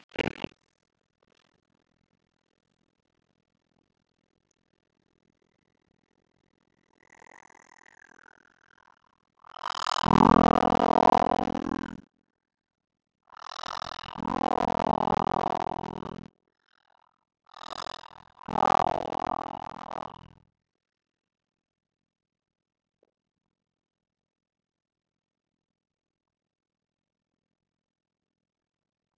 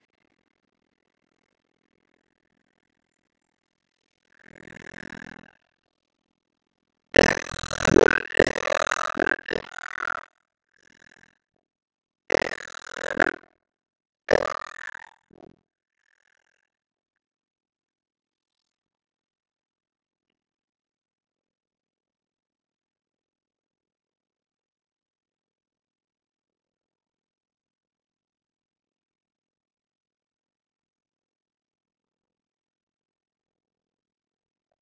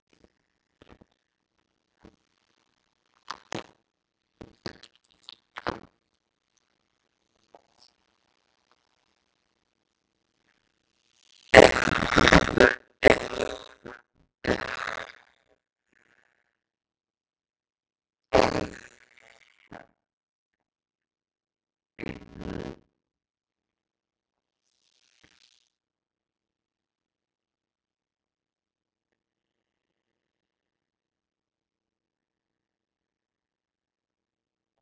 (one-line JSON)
{"exhalation_length": "29.2 s", "exhalation_amplitude": 19480, "exhalation_signal_mean_std_ratio": 0.2, "cough_length": "34.8 s", "cough_amplitude": 32768, "cough_signal_mean_std_ratio": 0.13, "three_cough_length": "34.8 s", "three_cough_amplitude": 32768, "three_cough_signal_mean_std_ratio": 0.11, "survey_phase": "beta (2021-08-13 to 2022-03-07)", "age": "45-64", "gender": "Female", "wearing_mask": "No", "symptom_cough_any": true, "symptom_new_continuous_cough": true, "symptom_runny_or_blocked_nose": true, "symptom_sore_throat": true, "symptom_fatigue": true, "symptom_onset": "2 days", "smoker_status": "Never smoked", "respiratory_condition_asthma": false, "respiratory_condition_other": false, "recruitment_source": "Test and Trace", "submission_delay": "1 day", "covid_test_result": "Negative", "covid_test_method": "RT-qPCR"}